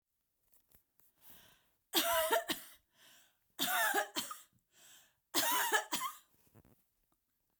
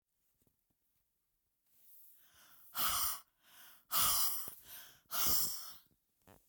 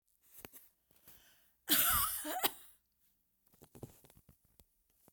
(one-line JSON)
{"three_cough_length": "7.6 s", "three_cough_amplitude": 5826, "three_cough_signal_mean_std_ratio": 0.42, "exhalation_length": "6.5 s", "exhalation_amplitude": 3683, "exhalation_signal_mean_std_ratio": 0.42, "cough_length": "5.1 s", "cough_amplitude": 6210, "cough_signal_mean_std_ratio": 0.32, "survey_phase": "beta (2021-08-13 to 2022-03-07)", "age": "65+", "gender": "Female", "wearing_mask": "No", "symptom_none": true, "smoker_status": "Ex-smoker", "respiratory_condition_asthma": false, "respiratory_condition_other": false, "recruitment_source": "REACT", "submission_delay": "1 day", "covid_test_result": "Negative", "covid_test_method": "RT-qPCR"}